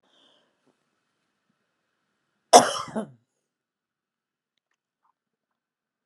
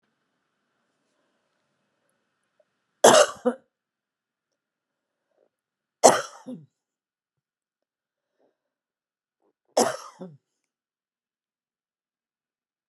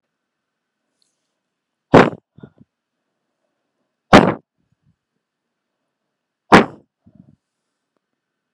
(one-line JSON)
{"cough_length": "6.1 s", "cough_amplitude": 32767, "cough_signal_mean_std_ratio": 0.14, "three_cough_length": "12.9 s", "three_cough_amplitude": 32768, "three_cough_signal_mean_std_ratio": 0.16, "exhalation_length": "8.5 s", "exhalation_amplitude": 32768, "exhalation_signal_mean_std_ratio": 0.18, "survey_phase": "beta (2021-08-13 to 2022-03-07)", "age": "65+", "gender": "Female", "wearing_mask": "No", "symptom_none": true, "smoker_status": "Ex-smoker", "respiratory_condition_asthma": true, "respiratory_condition_other": false, "recruitment_source": "REACT", "submission_delay": "2 days", "covid_test_result": "Negative", "covid_test_method": "RT-qPCR", "influenza_a_test_result": "Unknown/Void", "influenza_b_test_result": "Unknown/Void"}